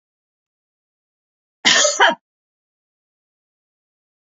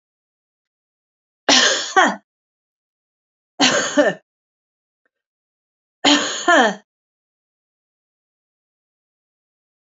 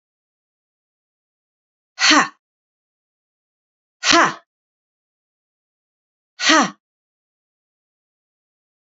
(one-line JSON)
{"cough_length": "4.3 s", "cough_amplitude": 28540, "cough_signal_mean_std_ratio": 0.25, "three_cough_length": "9.8 s", "three_cough_amplitude": 30895, "three_cough_signal_mean_std_ratio": 0.31, "exhalation_length": "8.9 s", "exhalation_amplitude": 31359, "exhalation_signal_mean_std_ratio": 0.23, "survey_phase": "beta (2021-08-13 to 2022-03-07)", "age": "65+", "gender": "Female", "wearing_mask": "No", "symptom_none": true, "smoker_status": "Never smoked", "respiratory_condition_asthma": false, "respiratory_condition_other": false, "recruitment_source": "REACT", "submission_delay": "1 day", "covid_test_result": "Negative", "covid_test_method": "RT-qPCR", "influenza_a_test_result": "Negative", "influenza_b_test_result": "Negative"}